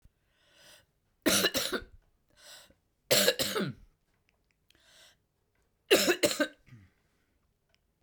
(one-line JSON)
{"three_cough_length": "8.0 s", "three_cough_amplitude": 10618, "three_cough_signal_mean_std_ratio": 0.33, "survey_phase": "beta (2021-08-13 to 2022-03-07)", "age": "45-64", "gender": "Female", "wearing_mask": "No", "symptom_new_continuous_cough": true, "symptom_runny_or_blocked_nose": true, "symptom_shortness_of_breath": true, "symptom_fatigue": true, "symptom_fever_high_temperature": true, "symptom_headache": true, "symptom_onset": "3 days", "smoker_status": "Never smoked", "respiratory_condition_asthma": false, "respiratory_condition_other": false, "recruitment_source": "Test and Trace", "submission_delay": "1 day", "covid_test_result": "Positive", "covid_test_method": "RT-qPCR", "covid_ct_value": 23.2, "covid_ct_gene": "ORF1ab gene"}